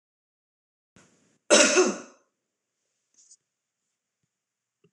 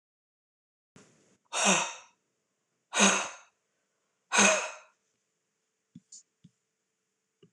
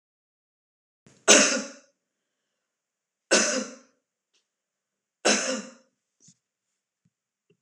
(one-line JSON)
{"cough_length": "4.9 s", "cough_amplitude": 19643, "cough_signal_mean_std_ratio": 0.23, "exhalation_length": "7.5 s", "exhalation_amplitude": 11153, "exhalation_signal_mean_std_ratio": 0.29, "three_cough_length": "7.6 s", "three_cough_amplitude": 26028, "three_cough_signal_mean_std_ratio": 0.26, "survey_phase": "alpha (2021-03-01 to 2021-08-12)", "age": "45-64", "gender": "Female", "wearing_mask": "No", "symptom_none": true, "smoker_status": "Never smoked", "respiratory_condition_asthma": false, "respiratory_condition_other": false, "recruitment_source": "REACT", "submission_delay": "3 days", "covid_test_method": "RT-qPCR"}